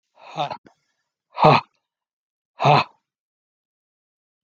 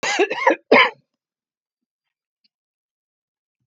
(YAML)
exhalation_length: 4.4 s
exhalation_amplitude: 32768
exhalation_signal_mean_std_ratio: 0.26
cough_length: 3.7 s
cough_amplitude: 32768
cough_signal_mean_std_ratio: 0.3
survey_phase: beta (2021-08-13 to 2022-03-07)
age: 65+
gender: Male
wearing_mask: 'No'
symptom_cough_any: true
symptom_new_continuous_cough: true
symptom_runny_or_blocked_nose: true
symptom_diarrhoea: true
symptom_fatigue: true
symptom_other: true
symptom_onset: 3 days
smoker_status: Never smoked
respiratory_condition_asthma: false
respiratory_condition_other: false
recruitment_source: Test and Trace
submission_delay: 2 days
covid_test_result: Positive
covid_test_method: RT-qPCR